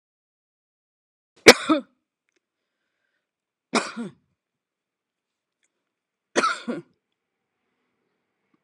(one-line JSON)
{"three_cough_length": "8.6 s", "three_cough_amplitude": 32768, "three_cough_signal_mean_std_ratio": 0.16, "survey_phase": "alpha (2021-03-01 to 2021-08-12)", "age": "45-64", "gender": "Female", "wearing_mask": "No", "symptom_none": true, "smoker_status": "Never smoked", "respiratory_condition_asthma": false, "respiratory_condition_other": false, "recruitment_source": "REACT", "submission_delay": "2 days", "covid_test_result": "Negative", "covid_test_method": "RT-qPCR"}